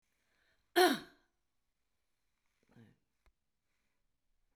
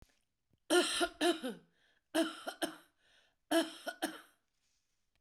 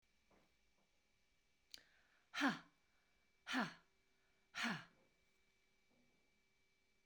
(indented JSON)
{
  "cough_length": "4.6 s",
  "cough_amplitude": 6305,
  "cough_signal_mean_std_ratio": 0.18,
  "three_cough_length": "5.2 s",
  "three_cough_amplitude": 5121,
  "three_cough_signal_mean_std_ratio": 0.39,
  "exhalation_length": "7.1 s",
  "exhalation_amplitude": 1458,
  "exhalation_signal_mean_std_ratio": 0.27,
  "survey_phase": "beta (2021-08-13 to 2022-03-07)",
  "age": "65+",
  "gender": "Female",
  "wearing_mask": "No",
  "symptom_cough_any": true,
  "symptom_onset": "12 days",
  "smoker_status": "Never smoked",
  "respiratory_condition_asthma": false,
  "respiratory_condition_other": false,
  "recruitment_source": "REACT",
  "submission_delay": "2 days",
  "covid_test_result": "Negative",
  "covid_test_method": "RT-qPCR",
  "influenza_a_test_result": "Negative",
  "influenza_b_test_result": "Negative"
}